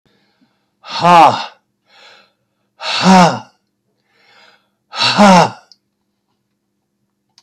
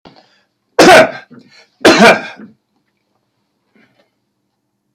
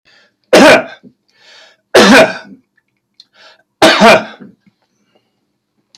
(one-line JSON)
{"exhalation_length": "7.4 s", "exhalation_amplitude": 32768, "exhalation_signal_mean_std_ratio": 0.35, "cough_length": "4.9 s", "cough_amplitude": 32768, "cough_signal_mean_std_ratio": 0.33, "three_cough_length": "6.0 s", "three_cough_amplitude": 32768, "three_cough_signal_mean_std_ratio": 0.39, "survey_phase": "alpha (2021-03-01 to 2021-08-12)", "age": "65+", "gender": "Male", "wearing_mask": "No", "symptom_none": true, "smoker_status": "Ex-smoker", "respiratory_condition_asthma": false, "respiratory_condition_other": false, "recruitment_source": "REACT", "submission_delay": "5 days", "covid_test_result": "Negative", "covid_test_method": "RT-qPCR"}